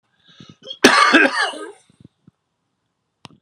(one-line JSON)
{"cough_length": "3.4 s", "cough_amplitude": 32768, "cough_signal_mean_std_ratio": 0.35, "survey_phase": "alpha (2021-03-01 to 2021-08-12)", "age": "45-64", "gender": "Female", "wearing_mask": "No", "symptom_cough_any": true, "symptom_shortness_of_breath": true, "symptom_headache": true, "symptom_onset": "3 days", "smoker_status": "Ex-smoker", "respiratory_condition_asthma": false, "respiratory_condition_other": false, "recruitment_source": "Test and Trace", "submission_delay": "2 days", "covid_test_result": "Positive", "covid_test_method": "RT-qPCR", "covid_ct_value": 17.3, "covid_ct_gene": "ORF1ab gene", "covid_ct_mean": 17.6, "covid_viral_load": "1700000 copies/ml", "covid_viral_load_category": "High viral load (>1M copies/ml)"}